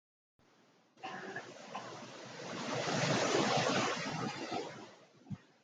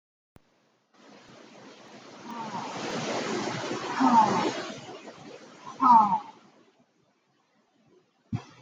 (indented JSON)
{
  "cough_length": "5.6 s",
  "cough_amplitude": 3717,
  "cough_signal_mean_std_ratio": 0.65,
  "exhalation_length": "8.6 s",
  "exhalation_amplitude": 12870,
  "exhalation_signal_mean_std_ratio": 0.41,
  "survey_phase": "beta (2021-08-13 to 2022-03-07)",
  "age": "65+",
  "gender": "Female",
  "wearing_mask": "No",
  "symptom_none": true,
  "smoker_status": "Never smoked",
  "respiratory_condition_asthma": false,
  "respiratory_condition_other": false,
  "recruitment_source": "REACT",
  "submission_delay": "1 day",
  "covid_test_result": "Negative",
  "covid_test_method": "RT-qPCR"
}